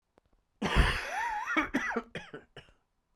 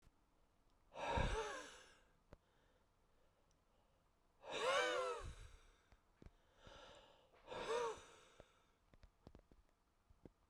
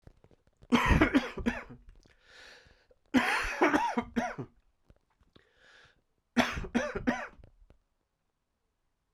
{
  "cough_length": "3.2 s",
  "cough_amplitude": 8575,
  "cough_signal_mean_std_ratio": 0.52,
  "exhalation_length": "10.5 s",
  "exhalation_amplitude": 1745,
  "exhalation_signal_mean_std_ratio": 0.4,
  "three_cough_length": "9.1 s",
  "three_cough_amplitude": 11844,
  "three_cough_signal_mean_std_ratio": 0.4,
  "survey_phase": "beta (2021-08-13 to 2022-03-07)",
  "age": "45-64",
  "gender": "Male",
  "wearing_mask": "No",
  "symptom_cough_any": true,
  "symptom_runny_or_blocked_nose": true,
  "symptom_sore_throat": true,
  "symptom_fatigue": true,
  "symptom_fever_high_temperature": true,
  "symptom_headache": true,
  "symptom_change_to_sense_of_smell_or_taste": true,
  "symptom_onset": "3 days",
  "smoker_status": "Never smoked",
  "respiratory_condition_asthma": false,
  "respiratory_condition_other": false,
  "recruitment_source": "Test and Trace",
  "submission_delay": "2 days",
  "covid_test_result": "Positive",
  "covid_test_method": "ePCR"
}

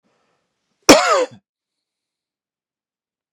{
  "cough_length": "3.3 s",
  "cough_amplitude": 32768,
  "cough_signal_mean_std_ratio": 0.24,
  "survey_phase": "beta (2021-08-13 to 2022-03-07)",
  "age": "45-64",
  "gender": "Male",
  "wearing_mask": "No",
  "symptom_cough_any": true,
  "symptom_new_continuous_cough": true,
  "symptom_sore_throat": true,
  "symptom_fatigue": true,
  "symptom_other": true,
  "smoker_status": "Never smoked",
  "respiratory_condition_asthma": false,
  "respiratory_condition_other": false,
  "recruitment_source": "Test and Trace",
  "submission_delay": "1 day",
  "covid_test_result": "Positive",
  "covid_test_method": "LFT"
}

